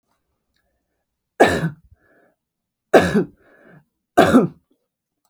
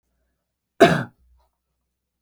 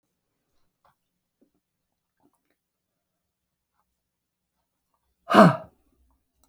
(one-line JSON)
{"three_cough_length": "5.3 s", "three_cough_amplitude": 32768, "three_cough_signal_mean_std_ratio": 0.3, "cough_length": "2.2 s", "cough_amplitude": 32768, "cough_signal_mean_std_ratio": 0.21, "exhalation_length": "6.5 s", "exhalation_amplitude": 32485, "exhalation_signal_mean_std_ratio": 0.15, "survey_phase": "beta (2021-08-13 to 2022-03-07)", "age": "65+", "gender": "Female", "wearing_mask": "No", "symptom_fatigue": true, "symptom_onset": "12 days", "smoker_status": "Never smoked", "respiratory_condition_asthma": false, "respiratory_condition_other": false, "recruitment_source": "REACT", "submission_delay": "2 days", "covid_test_result": "Negative", "covid_test_method": "RT-qPCR", "influenza_a_test_result": "Negative", "influenza_b_test_result": "Negative"}